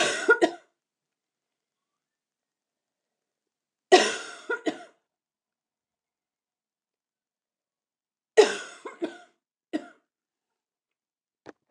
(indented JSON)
{
  "three_cough_length": "11.7 s",
  "three_cough_amplitude": 21632,
  "three_cough_signal_mean_std_ratio": 0.21,
  "survey_phase": "beta (2021-08-13 to 2022-03-07)",
  "age": "45-64",
  "gender": "Female",
  "wearing_mask": "No",
  "symptom_cough_any": true,
  "symptom_runny_or_blocked_nose": true,
  "symptom_sore_throat": true,
  "symptom_fatigue": true,
  "symptom_change_to_sense_of_smell_or_taste": true,
  "symptom_other": true,
  "symptom_onset": "4 days",
  "smoker_status": "Never smoked",
  "respiratory_condition_asthma": false,
  "respiratory_condition_other": false,
  "recruitment_source": "Test and Trace",
  "submission_delay": "2 days",
  "covid_test_result": "Positive",
  "covid_test_method": "RT-qPCR",
  "covid_ct_value": 23.5,
  "covid_ct_gene": "ORF1ab gene"
}